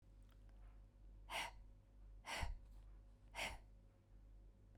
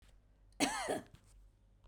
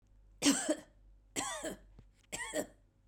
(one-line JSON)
{"exhalation_length": "4.8 s", "exhalation_amplitude": 868, "exhalation_signal_mean_std_ratio": 0.65, "cough_length": "1.9 s", "cough_amplitude": 5334, "cough_signal_mean_std_ratio": 0.41, "three_cough_length": "3.1 s", "three_cough_amplitude": 5003, "three_cough_signal_mean_std_ratio": 0.43, "survey_phase": "beta (2021-08-13 to 2022-03-07)", "age": "45-64", "gender": "Female", "wearing_mask": "No", "symptom_runny_or_blocked_nose": true, "symptom_abdominal_pain": true, "symptom_fatigue": true, "smoker_status": "Never smoked", "respiratory_condition_asthma": false, "respiratory_condition_other": false, "recruitment_source": "REACT", "submission_delay": "1 day", "covid_test_result": "Negative", "covid_test_method": "RT-qPCR"}